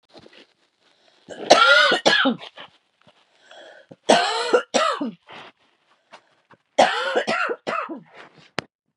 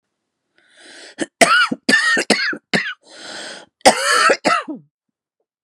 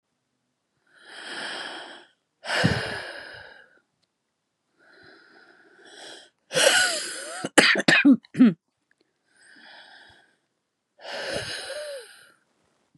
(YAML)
three_cough_length: 9.0 s
three_cough_amplitude: 32768
three_cough_signal_mean_std_ratio: 0.42
cough_length: 5.6 s
cough_amplitude: 32768
cough_signal_mean_std_ratio: 0.47
exhalation_length: 13.0 s
exhalation_amplitude: 32768
exhalation_signal_mean_std_ratio: 0.34
survey_phase: beta (2021-08-13 to 2022-03-07)
age: 18-44
gender: Female
wearing_mask: 'No'
symptom_shortness_of_breath: true
symptom_diarrhoea: true
symptom_fatigue: true
symptom_onset: 11 days
smoker_status: Ex-smoker
respiratory_condition_asthma: false
respiratory_condition_other: false
recruitment_source: REACT
submission_delay: 1 day
covid_test_result: Negative
covid_test_method: RT-qPCR
covid_ct_value: 38.7
covid_ct_gene: E gene
influenza_a_test_result: Negative
influenza_b_test_result: Negative